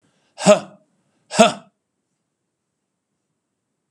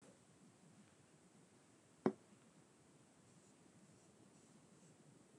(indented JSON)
{
  "exhalation_length": "3.9 s",
  "exhalation_amplitude": 32768,
  "exhalation_signal_mean_std_ratio": 0.22,
  "cough_length": "5.4 s",
  "cough_amplitude": 2760,
  "cough_signal_mean_std_ratio": 0.24,
  "survey_phase": "beta (2021-08-13 to 2022-03-07)",
  "age": "65+",
  "gender": "Male",
  "wearing_mask": "No",
  "symptom_none": true,
  "symptom_onset": "6 days",
  "smoker_status": "Never smoked",
  "respiratory_condition_asthma": false,
  "respiratory_condition_other": false,
  "recruitment_source": "REACT",
  "submission_delay": "2 days",
  "covid_test_result": "Negative",
  "covid_test_method": "RT-qPCR",
  "influenza_a_test_result": "Negative",
  "influenza_b_test_result": "Negative"
}